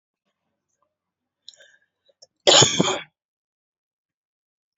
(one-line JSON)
{"cough_length": "4.8 s", "cough_amplitude": 30457, "cough_signal_mean_std_ratio": 0.23, "survey_phase": "beta (2021-08-13 to 2022-03-07)", "age": "45-64", "gender": "Female", "wearing_mask": "No", "symptom_runny_or_blocked_nose": true, "symptom_sore_throat": true, "symptom_onset": "12 days", "smoker_status": "Ex-smoker", "respiratory_condition_asthma": false, "respiratory_condition_other": false, "recruitment_source": "REACT", "submission_delay": "2 days", "covid_test_result": "Negative", "covid_test_method": "RT-qPCR", "influenza_a_test_result": "Negative", "influenza_b_test_result": "Negative"}